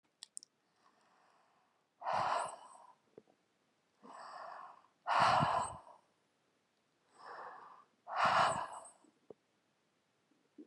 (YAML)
exhalation_length: 10.7 s
exhalation_amplitude: 4089
exhalation_signal_mean_std_ratio: 0.36
survey_phase: beta (2021-08-13 to 2022-03-07)
age: 65+
gender: Female
wearing_mask: 'No'
symptom_abdominal_pain: true
symptom_fatigue: true
symptom_onset: 12 days
smoker_status: Current smoker (1 to 10 cigarettes per day)
respiratory_condition_asthma: false
respiratory_condition_other: false
recruitment_source: REACT
submission_delay: 3 days
covid_test_result: Negative
covid_test_method: RT-qPCR